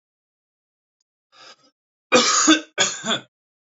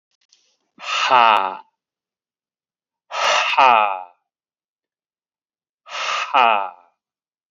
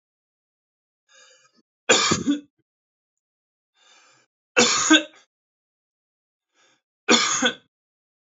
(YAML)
cough_length: 3.7 s
cough_amplitude: 27827
cough_signal_mean_std_ratio: 0.36
exhalation_length: 7.5 s
exhalation_amplitude: 29973
exhalation_signal_mean_std_ratio: 0.39
three_cough_length: 8.4 s
three_cough_amplitude: 27600
three_cough_signal_mean_std_ratio: 0.3
survey_phase: alpha (2021-03-01 to 2021-08-12)
age: 18-44
gender: Male
wearing_mask: 'No'
symptom_none: true
smoker_status: Never smoked
respiratory_condition_asthma: false
respiratory_condition_other: false
recruitment_source: REACT
submission_delay: 1 day
covid_test_result: Negative
covid_test_method: RT-qPCR